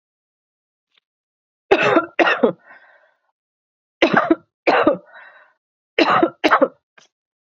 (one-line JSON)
{"three_cough_length": "7.4 s", "three_cough_amplitude": 29481, "three_cough_signal_mean_std_ratio": 0.38, "survey_phase": "beta (2021-08-13 to 2022-03-07)", "age": "45-64", "gender": "Female", "wearing_mask": "No", "symptom_none": true, "smoker_status": "Current smoker (1 to 10 cigarettes per day)", "respiratory_condition_asthma": false, "respiratory_condition_other": false, "recruitment_source": "REACT", "submission_delay": "13 days", "covid_test_result": "Negative", "covid_test_method": "RT-qPCR", "influenza_a_test_result": "Negative", "influenza_b_test_result": "Negative"}